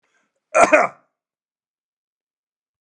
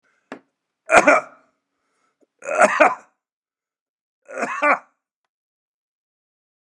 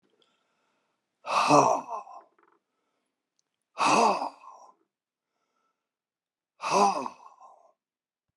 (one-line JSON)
{"cough_length": "2.8 s", "cough_amplitude": 32767, "cough_signal_mean_std_ratio": 0.25, "three_cough_length": "6.7 s", "three_cough_amplitude": 32768, "three_cough_signal_mean_std_ratio": 0.29, "exhalation_length": "8.4 s", "exhalation_amplitude": 17088, "exhalation_signal_mean_std_ratio": 0.33, "survey_phase": "beta (2021-08-13 to 2022-03-07)", "age": "65+", "gender": "Male", "wearing_mask": "No", "symptom_cough_any": true, "smoker_status": "Ex-smoker", "respiratory_condition_asthma": false, "respiratory_condition_other": false, "recruitment_source": "REACT", "submission_delay": "1 day", "covid_test_result": "Negative", "covid_test_method": "RT-qPCR"}